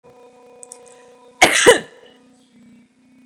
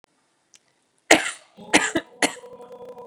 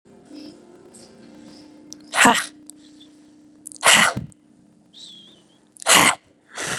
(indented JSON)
{
  "cough_length": "3.3 s",
  "cough_amplitude": 32768,
  "cough_signal_mean_std_ratio": 0.27,
  "three_cough_length": "3.1 s",
  "three_cough_amplitude": 32768,
  "three_cough_signal_mean_std_ratio": 0.29,
  "exhalation_length": "6.8 s",
  "exhalation_amplitude": 31949,
  "exhalation_signal_mean_std_ratio": 0.32,
  "survey_phase": "beta (2021-08-13 to 2022-03-07)",
  "age": "18-44",
  "gender": "Female",
  "wearing_mask": "No",
  "symptom_none": true,
  "smoker_status": "Never smoked",
  "respiratory_condition_asthma": false,
  "respiratory_condition_other": false,
  "recruitment_source": "REACT",
  "submission_delay": "3 days",
  "covid_test_result": "Negative",
  "covid_test_method": "RT-qPCR",
  "influenza_a_test_result": "Negative",
  "influenza_b_test_result": "Negative"
}